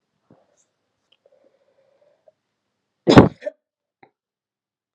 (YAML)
cough_length: 4.9 s
cough_amplitude: 32768
cough_signal_mean_std_ratio: 0.15
survey_phase: beta (2021-08-13 to 2022-03-07)
age: 18-44
gender: Female
wearing_mask: 'No'
symptom_cough_any: true
symptom_new_continuous_cough: true
symptom_runny_or_blocked_nose: true
symptom_shortness_of_breath: true
symptom_fatigue: true
symptom_headache: true
symptom_other: true
symptom_onset: 5 days
smoker_status: Ex-smoker
respiratory_condition_asthma: false
respiratory_condition_other: false
recruitment_source: Test and Trace
submission_delay: 1 day
covid_test_result: Positive
covid_test_method: RT-qPCR
covid_ct_value: 20.3
covid_ct_gene: ORF1ab gene
covid_ct_mean: 20.6
covid_viral_load: 170000 copies/ml
covid_viral_load_category: Low viral load (10K-1M copies/ml)